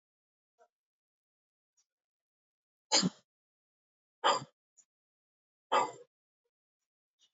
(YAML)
exhalation_length: 7.3 s
exhalation_amplitude: 7211
exhalation_signal_mean_std_ratio: 0.2
survey_phase: beta (2021-08-13 to 2022-03-07)
age: 45-64
gender: Male
wearing_mask: 'No'
symptom_cough_any: true
symptom_runny_or_blocked_nose: true
symptom_sore_throat: true
symptom_fatigue: true
symptom_headache: true
symptom_change_to_sense_of_smell_or_taste: true
symptom_onset: 2 days
smoker_status: Never smoked
respiratory_condition_asthma: false
respiratory_condition_other: false
recruitment_source: Test and Trace
submission_delay: 1 day
covid_test_result: Positive
covid_test_method: RT-qPCR
covid_ct_value: 19.8
covid_ct_gene: ORF1ab gene
covid_ct_mean: 20.2
covid_viral_load: 240000 copies/ml
covid_viral_load_category: Low viral load (10K-1M copies/ml)